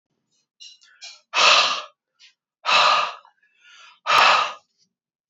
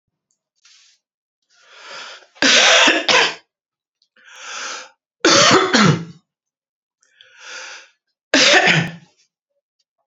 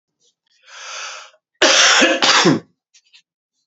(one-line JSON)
{"exhalation_length": "5.3 s", "exhalation_amplitude": 25677, "exhalation_signal_mean_std_ratio": 0.42, "three_cough_length": "10.1 s", "three_cough_amplitude": 32678, "three_cough_signal_mean_std_ratio": 0.41, "cough_length": "3.7 s", "cough_amplitude": 32626, "cough_signal_mean_std_ratio": 0.46, "survey_phase": "beta (2021-08-13 to 2022-03-07)", "age": "45-64", "gender": "Male", "wearing_mask": "No", "symptom_cough_any": true, "symptom_new_continuous_cough": true, "symptom_runny_or_blocked_nose": true, "symptom_sore_throat": true, "symptom_headache": true, "smoker_status": "Ex-smoker", "respiratory_condition_asthma": false, "respiratory_condition_other": false, "recruitment_source": "Test and Trace", "submission_delay": "0 days", "covid_test_result": "Positive", "covid_test_method": "LFT"}